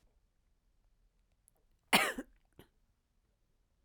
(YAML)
cough_length: 3.8 s
cough_amplitude: 7581
cough_signal_mean_std_ratio: 0.19
survey_phase: beta (2021-08-13 to 2022-03-07)
age: 45-64
gender: Female
wearing_mask: 'No'
symptom_cough_any: true
symptom_runny_or_blocked_nose: true
symptom_onset: 3 days
smoker_status: Never smoked
respiratory_condition_asthma: true
respiratory_condition_other: false
recruitment_source: Test and Trace
submission_delay: 2 days
covid_test_result: Positive
covid_test_method: RT-qPCR